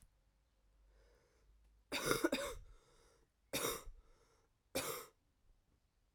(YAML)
three_cough_length: 6.1 s
three_cough_amplitude: 4428
three_cough_signal_mean_std_ratio: 0.36
survey_phase: alpha (2021-03-01 to 2021-08-12)
age: 18-44
gender: Female
wearing_mask: 'No'
symptom_cough_any: true
symptom_fatigue: true
symptom_fever_high_temperature: true
symptom_headache: true
symptom_onset: 3 days
smoker_status: Never smoked
respiratory_condition_asthma: false
respiratory_condition_other: false
recruitment_source: Test and Trace
submission_delay: 1 day
covid_test_result: Positive
covid_test_method: RT-qPCR